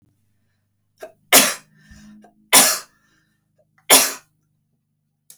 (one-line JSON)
{"three_cough_length": "5.4 s", "three_cough_amplitude": 32768, "three_cough_signal_mean_std_ratio": 0.27, "survey_phase": "beta (2021-08-13 to 2022-03-07)", "age": "45-64", "gender": "Female", "wearing_mask": "No", "symptom_runny_or_blocked_nose": true, "smoker_status": "Ex-smoker", "respiratory_condition_asthma": false, "respiratory_condition_other": false, "recruitment_source": "REACT", "submission_delay": "1 day", "covid_test_result": "Negative", "covid_test_method": "RT-qPCR"}